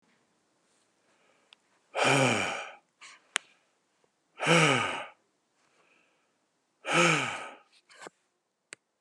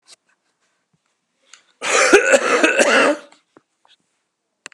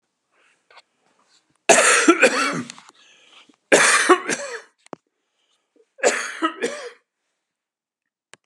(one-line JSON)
{"exhalation_length": "9.0 s", "exhalation_amplitude": 21965, "exhalation_signal_mean_std_ratio": 0.35, "cough_length": "4.7 s", "cough_amplitude": 32768, "cough_signal_mean_std_ratio": 0.42, "three_cough_length": "8.5 s", "three_cough_amplitude": 32767, "three_cough_signal_mean_std_ratio": 0.37, "survey_phase": "beta (2021-08-13 to 2022-03-07)", "age": "65+", "gender": "Male", "wearing_mask": "No", "symptom_none": true, "smoker_status": "Never smoked", "respiratory_condition_asthma": false, "respiratory_condition_other": false, "recruitment_source": "REACT", "submission_delay": "1 day", "covid_test_result": "Negative", "covid_test_method": "RT-qPCR", "influenza_a_test_result": "Negative", "influenza_b_test_result": "Negative"}